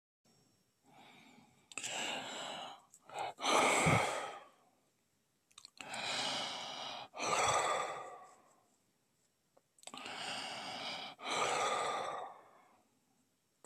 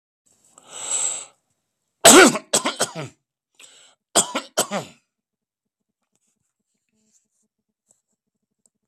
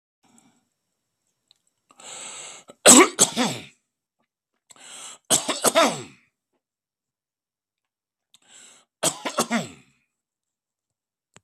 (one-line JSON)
{"exhalation_length": "13.7 s", "exhalation_amplitude": 4686, "exhalation_signal_mean_std_ratio": 0.53, "cough_length": "8.9 s", "cough_amplitude": 32768, "cough_signal_mean_std_ratio": 0.24, "three_cough_length": "11.4 s", "three_cough_amplitude": 32768, "three_cough_signal_mean_std_ratio": 0.25, "survey_phase": "beta (2021-08-13 to 2022-03-07)", "age": "65+", "gender": "Male", "wearing_mask": "No", "symptom_none": true, "smoker_status": "Ex-smoker", "respiratory_condition_asthma": false, "respiratory_condition_other": false, "recruitment_source": "REACT", "submission_delay": "0 days", "covid_test_result": "Negative", "covid_test_method": "RT-qPCR", "influenza_a_test_result": "Negative", "influenza_b_test_result": "Negative"}